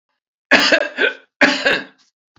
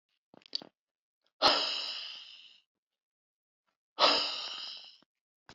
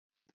three_cough_length: 2.4 s
three_cough_amplitude: 32767
three_cough_signal_mean_std_ratio: 0.48
exhalation_length: 5.5 s
exhalation_amplitude: 9769
exhalation_signal_mean_std_ratio: 0.34
cough_length: 0.3 s
cough_amplitude: 84
cough_signal_mean_std_ratio: 0.27
survey_phase: beta (2021-08-13 to 2022-03-07)
age: 65+
gender: Male
wearing_mask: 'No'
symptom_none: true
smoker_status: Never smoked
respiratory_condition_asthma: false
respiratory_condition_other: false
recruitment_source: REACT
submission_delay: 1 day
covid_test_result: Negative
covid_test_method: RT-qPCR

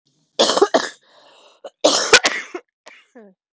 three_cough_length: 3.6 s
three_cough_amplitude: 31655
three_cough_signal_mean_std_ratio: 0.37
survey_phase: beta (2021-08-13 to 2022-03-07)
age: 45-64
gender: Female
wearing_mask: 'No'
symptom_cough_any: true
symptom_runny_or_blocked_nose: true
symptom_shortness_of_breath: true
symptom_sore_throat: true
symptom_abdominal_pain: true
symptom_fever_high_temperature: true
symptom_headache: true
symptom_change_to_sense_of_smell_or_taste: true
symptom_loss_of_taste: true
smoker_status: Never smoked
respiratory_condition_asthma: true
respiratory_condition_other: false
recruitment_source: Test and Trace
submission_delay: 2 days
covid_test_result: Positive
covid_test_method: LFT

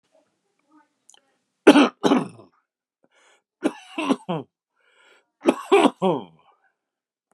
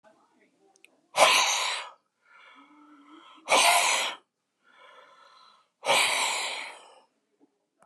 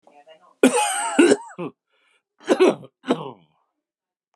three_cough_length: 7.3 s
three_cough_amplitude: 32768
three_cough_signal_mean_std_ratio: 0.29
exhalation_length: 7.9 s
exhalation_amplitude: 17894
exhalation_signal_mean_std_ratio: 0.41
cough_length: 4.4 s
cough_amplitude: 28106
cough_signal_mean_std_ratio: 0.39
survey_phase: beta (2021-08-13 to 2022-03-07)
age: 65+
gender: Male
wearing_mask: 'No'
symptom_runny_or_blocked_nose: true
symptom_shortness_of_breath: true
smoker_status: Ex-smoker
respiratory_condition_asthma: false
respiratory_condition_other: false
recruitment_source: REACT
submission_delay: 2 days
covid_test_result: Negative
covid_test_method: RT-qPCR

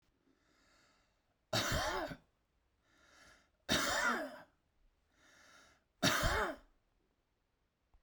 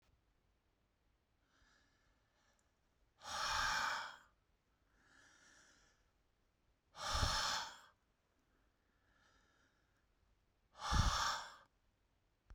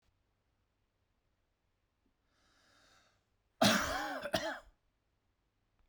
three_cough_length: 8.0 s
three_cough_amplitude: 4169
three_cough_signal_mean_std_ratio: 0.39
exhalation_length: 12.5 s
exhalation_amplitude: 2583
exhalation_signal_mean_std_ratio: 0.35
cough_length: 5.9 s
cough_amplitude: 5525
cough_signal_mean_std_ratio: 0.28
survey_phase: beta (2021-08-13 to 2022-03-07)
age: 45-64
gender: Male
wearing_mask: 'No'
symptom_runny_or_blocked_nose: true
smoker_status: Never smoked
respiratory_condition_asthma: false
respiratory_condition_other: false
recruitment_source: REACT
submission_delay: 2 days
covid_test_result: Negative
covid_test_method: RT-qPCR
influenza_a_test_result: Negative
influenza_b_test_result: Negative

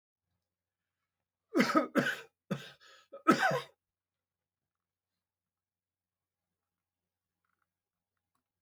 cough_length: 8.6 s
cough_amplitude: 8971
cough_signal_mean_std_ratio: 0.24
survey_phase: beta (2021-08-13 to 2022-03-07)
age: 65+
gender: Male
wearing_mask: 'No'
symptom_none: true
smoker_status: Never smoked
respiratory_condition_asthma: false
respiratory_condition_other: false
recruitment_source: REACT
submission_delay: 9 days
covid_test_result: Negative
covid_test_method: RT-qPCR
influenza_a_test_result: Negative
influenza_b_test_result: Negative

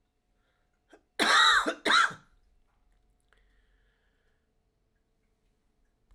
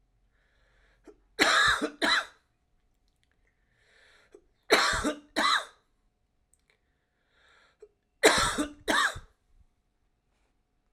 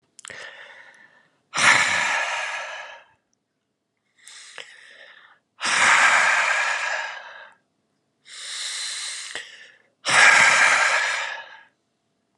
cough_length: 6.1 s
cough_amplitude: 12189
cough_signal_mean_std_ratio: 0.29
three_cough_length: 10.9 s
three_cough_amplitude: 18866
three_cough_signal_mean_std_ratio: 0.35
exhalation_length: 12.4 s
exhalation_amplitude: 26427
exhalation_signal_mean_std_ratio: 0.49
survey_phase: alpha (2021-03-01 to 2021-08-12)
age: 45-64
gender: Male
wearing_mask: 'No'
symptom_new_continuous_cough: true
symptom_change_to_sense_of_smell_or_taste: true
symptom_onset: 6 days
smoker_status: Never smoked
respiratory_condition_asthma: false
respiratory_condition_other: false
recruitment_source: Test and Trace
submission_delay: 1 day
covid_test_result: Positive
covid_test_method: RT-qPCR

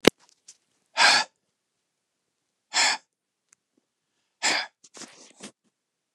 exhalation_length: 6.1 s
exhalation_amplitude: 28429
exhalation_signal_mean_std_ratio: 0.25
survey_phase: beta (2021-08-13 to 2022-03-07)
age: 45-64
gender: Male
wearing_mask: 'No'
symptom_none: true
smoker_status: Never smoked
respiratory_condition_asthma: false
respiratory_condition_other: false
recruitment_source: REACT
submission_delay: 2 days
covid_test_result: Negative
covid_test_method: RT-qPCR
influenza_a_test_result: Negative
influenza_b_test_result: Negative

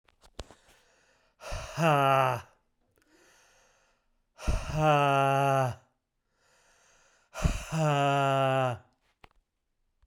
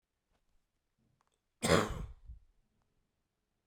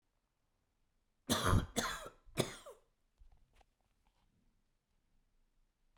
exhalation_length: 10.1 s
exhalation_amplitude: 9122
exhalation_signal_mean_std_ratio: 0.49
cough_length: 3.7 s
cough_amplitude: 7565
cough_signal_mean_std_ratio: 0.24
three_cough_length: 6.0 s
three_cough_amplitude: 4748
three_cough_signal_mean_std_ratio: 0.27
survey_phase: beta (2021-08-13 to 2022-03-07)
age: 18-44
gender: Male
wearing_mask: 'No'
symptom_cough_any: true
symptom_runny_or_blocked_nose: true
symptom_shortness_of_breath: true
symptom_fatigue: true
symptom_headache: true
symptom_change_to_sense_of_smell_or_taste: true
symptom_onset: 5 days
smoker_status: Never smoked
respiratory_condition_asthma: false
respiratory_condition_other: false
recruitment_source: Test and Trace
submission_delay: 1 day
covid_test_result: Positive
covid_test_method: RT-qPCR
covid_ct_value: 18.3
covid_ct_gene: ORF1ab gene
covid_ct_mean: 19.1
covid_viral_load: 560000 copies/ml
covid_viral_load_category: Low viral load (10K-1M copies/ml)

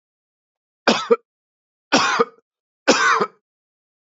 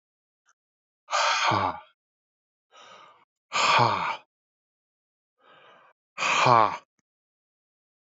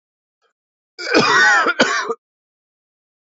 three_cough_length: 4.1 s
three_cough_amplitude: 28851
three_cough_signal_mean_std_ratio: 0.37
exhalation_length: 8.0 s
exhalation_amplitude: 19364
exhalation_signal_mean_std_ratio: 0.37
cough_length: 3.2 s
cough_amplitude: 28592
cough_signal_mean_std_ratio: 0.46
survey_phase: alpha (2021-03-01 to 2021-08-12)
age: 45-64
gender: Male
wearing_mask: 'No'
symptom_fatigue: true
symptom_onset: 8 days
smoker_status: Never smoked
respiratory_condition_asthma: false
respiratory_condition_other: false
recruitment_source: REACT
submission_delay: 1 day
covid_test_result: Negative
covid_test_method: RT-qPCR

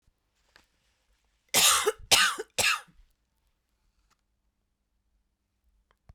cough_length: 6.1 s
cough_amplitude: 18042
cough_signal_mean_std_ratio: 0.29
survey_phase: beta (2021-08-13 to 2022-03-07)
age: 45-64
gender: Female
wearing_mask: 'No'
symptom_new_continuous_cough: true
symptom_runny_or_blocked_nose: true
symptom_sore_throat: true
symptom_diarrhoea: true
symptom_fatigue: true
symptom_fever_high_temperature: true
symptom_headache: true
symptom_change_to_sense_of_smell_or_taste: true
symptom_onset: 6 days
smoker_status: Never smoked
respiratory_condition_asthma: false
respiratory_condition_other: false
recruitment_source: Test and Trace
submission_delay: 2 days
covid_test_result: Positive
covid_test_method: RT-qPCR
covid_ct_value: 13.9
covid_ct_gene: ORF1ab gene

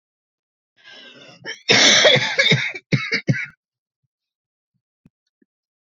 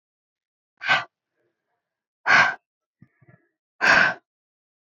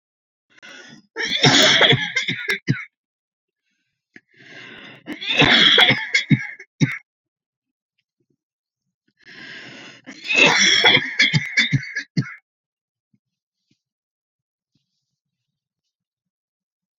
cough_length: 5.8 s
cough_amplitude: 30983
cough_signal_mean_std_ratio: 0.38
exhalation_length: 4.9 s
exhalation_amplitude: 21593
exhalation_signal_mean_std_ratio: 0.31
three_cough_length: 17.0 s
three_cough_amplitude: 30811
three_cough_signal_mean_std_ratio: 0.38
survey_phase: beta (2021-08-13 to 2022-03-07)
age: 18-44
gender: Female
wearing_mask: 'No'
symptom_fatigue: true
symptom_onset: 12 days
smoker_status: Never smoked
respiratory_condition_asthma: true
respiratory_condition_other: false
recruitment_source: REACT
submission_delay: 1 day
covid_test_result: Negative
covid_test_method: RT-qPCR
influenza_a_test_result: Negative
influenza_b_test_result: Negative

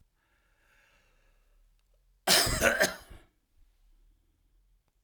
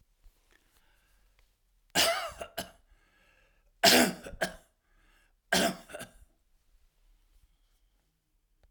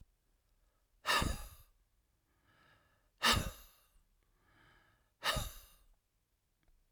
cough_length: 5.0 s
cough_amplitude: 14456
cough_signal_mean_std_ratio: 0.29
three_cough_length: 8.7 s
three_cough_amplitude: 16236
three_cough_signal_mean_std_ratio: 0.27
exhalation_length: 6.9 s
exhalation_amplitude: 4663
exhalation_signal_mean_std_ratio: 0.29
survey_phase: alpha (2021-03-01 to 2021-08-12)
age: 65+
gender: Male
wearing_mask: 'No'
symptom_none: true
smoker_status: Prefer not to say
respiratory_condition_asthma: false
respiratory_condition_other: false
recruitment_source: REACT
submission_delay: 5 days
covid_test_result: Negative
covid_test_method: RT-qPCR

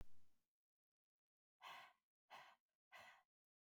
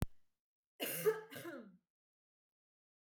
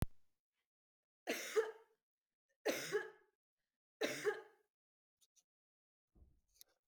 exhalation_length: 3.7 s
exhalation_amplitude: 202
exhalation_signal_mean_std_ratio: 0.43
cough_length: 3.2 s
cough_amplitude: 3133
cough_signal_mean_std_ratio: 0.33
three_cough_length: 6.9 s
three_cough_amplitude: 2593
three_cough_signal_mean_std_ratio: 0.32
survey_phase: beta (2021-08-13 to 2022-03-07)
age: 18-44
gender: Female
wearing_mask: 'No'
symptom_none: true
smoker_status: Never smoked
respiratory_condition_asthma: false
respiratory_condition_other: false
recruitment_source: REACT
submission_delay: 0 days
covid_test_result: Negative
covid_test_method: RT-qPCR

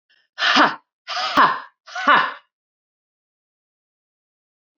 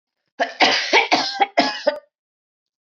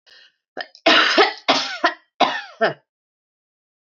exhalation_length: 4.8 s
exhalation_amplitude: 25617
exhalation_signal_mean_std_ratio: 0.36
cough_length: 2.9 s
cough_amplitude: 25519
cough_signal_mean_std_ratio: 0.49
three_cough_length: 3.8 s
three_cough_amplitude: 26003
three_cough_signal_mean_std_ratio: 0.42
survey_phase: beta (2021-08-13 to 2022-03-07)
age: 45-64
gender: Female
wearing_mask: 'No'
symptom_none: true
smoker_status: Never smoked
respiratory_condition_asthma: false
respiratory_condition_other: false
recruitment_source: REACT
submission_delay: 1 day
covid_test_result: Negative
covid_test_method: RT-qPCR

